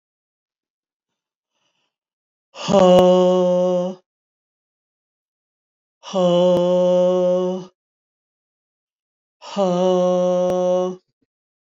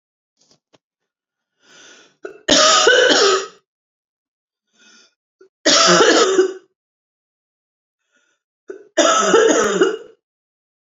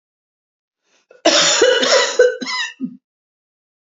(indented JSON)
{
  "exhalation_length": "11.7 s",
  "exhalation_amplitude": 26671,
  "exhalation_signal_mean_std_ratio": 0.52,
  "three_cough_length": "10.8 s",
  "three_cough_amplitude": 30668,
  "three_cough_signal_mean_std_ratio": 0.44,
  "cough_length": "3.9 s",
  "cough_amplitude": 30030,
  "cough_signal_mean_std_ratio": 0.48,
  "survey_phase": "beta (2021-08-13 to 2022-03-07)",
  "age": "45-64",
  "gender": "Female",
  "wearing_mask": "No",
  "symptom_runny_or_blocked_nose": true,
  "symptom_abdominal_pain": true,
  "symptom_fatigue": true,
  "symptom_headache": true,
  "symptom_change_to_sense_of_smell_or_taste": true,
  "symptom_onset": "12 days",
  "smoker_status": "Never smoked",
  "respiratory_condition_asthma": false,
  "respiratory_condition_other": false,
  "recruitment_source": "REACT",
  "submission_delay": "2 days",
  "covid_test_result": "Negative",
  "covid_test_method": "RT-qPCR",
  "influenza_a_test_result": "Negative",
  "influenza_b_test_result": "Negative"
}